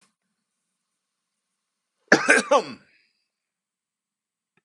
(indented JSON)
{
  "cough_length": "4.6 s",
  "cough_amplitude": 29675,
  "cough_signal_mean_std_ratio": 0.22,
  "survey_phase": "beta (2021-08-13 to 2022-03-07)",
  "age": "45-64",
  "gender": "Male",
  "wearing_mask": "No",
  "symptom_none": true,
  "smoker_status": "Never smoked",
  "respiratory_condition_asthma": false,
  "respiratory_condition_other": false,
  "recruitment_source": "REACT",
  "submission_delay": "4 days",
  "covid_test_result": "Negative",
  "covid_test_method": "RT-qPCR"
}